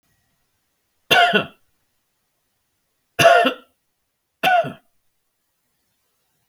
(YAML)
three_cough_length: 6.5 s
three_cough_amplitude: 32589
three_cough_signal_mean_std_ratio: 0.3
survey_phase: beta (2021-08-13 to 2022-03-07)
age: 65+
gender: Male
wearing_mask: 'No'
symptom_none: true
smoker_status: Never smoked
respiratory_condition_asthma: false
respiratory_condition_other: false
recruitment_source: REACT
submission_delay: 1 day
covid_test_result: Negative
covid_test_method: RT-qPCR